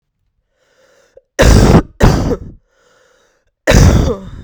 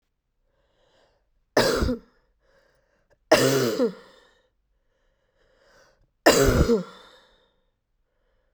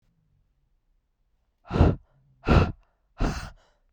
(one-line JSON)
{"cough_length": "4.4 s", "cough_amplitude": 32768, "cough_signal_mean_std_ratio": 0.46, "three_cough_length": "8.5 s", "three_cough_amplitude": 29169, "three_cough_signal_mean_std_ratio": 0.33, "exhalation_length": "3.9 s", "exhalation_amplitude": 16088, "exhalation_signal_mean_std_ratio": 0.31, "survey_phase": "beta (2021-08-13 to 2022-03-07)", "age": "18-44", "gender": "Female", "wearing_mask": "No", "symptom_cough_any": true, "symptom_runny_or_blocked_nose": true, "symptom_shortness_of_breath": true, "symptom_sore_throat": true, "symptom_fatigue": true, "symptom_fever_high_temperature": true, "symptom_headache": true, "symptom_change_to_sense_of_smell_or_taste": true, "symptom_loss_of_taste": true, "symptom_other": true, "symptom_onset": "2 days", "smoker_status": "Never smoked", "respiratory_condition_asthma": false, "respiratory_condition_other": false, "recruitment_source": "Test and Trace", "submission_delay": "1 day", "covid_test_result": "Positive", "covid_test_method": "RT-qPCR", "covid_ct_value": 14.4, "covid_ct_gene": "ORF1ab gene", "covid_ct_mean": 14.6, "covid_viral_load": "16000000 copies/ml", "covid_viral_load_category": "High viral load (>1M copies/ml)"}